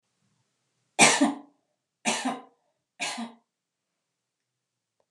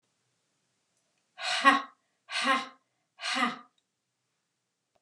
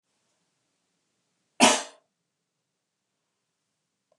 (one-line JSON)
{"three_cough_length": "5.1 s", "three_cough_amplitude": 25357, "three_cough_signal_mean_std_ratio": 0.28, "exhalation_length": "5.0 s", "exhalation_amplitude": 16863, "exhalation_signal_mean_std_ratio": 0.33, "cough_length": "4.2 s", "cough_amplitude": 24291, "cough_signal_mean_std_ratio": 0.17, "survey_phase": "beta (2021-08-13 to 2022-03-07)", "age": "45-64", "gender": "Female", "wearing_mask": "No", "symptom_none": true, "smoker_status": "Never smoked", "respiratory_condition_asthma": false, "respiratory_condition_other": false, "recruitment_source": "REACT", "submission_delay": "2 days", "covid_test_result": "Negative", "covid_test_method": "RT-qPCR", "influenza_a_test_result": "Negative", "influenza_b_test_result": "Negative"}